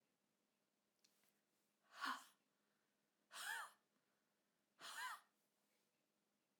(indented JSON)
{
  "exhalation_length": "6.6 s",
  "exhalation_amplitude": 592,
  "exhalation_signal_mean_std_ratio": 0.32,
  "survey_phase": "alpha (2021-03-01 to 2021-08-12)",
  "age": "65+",
  "gender": "Female",
  "wearing_mask": "No",
  "symptom_none": true,
  "smoker_status": "Never smoked",
  "respiratory_condition_asthma": false,
  "respiratory_condition_other": false,
  "recruitment_source": "REACT",
  "submission_delay": "1 day",
  "covid_test_result": "Negative",
  "covid_test_method": "RT-qPCR"
}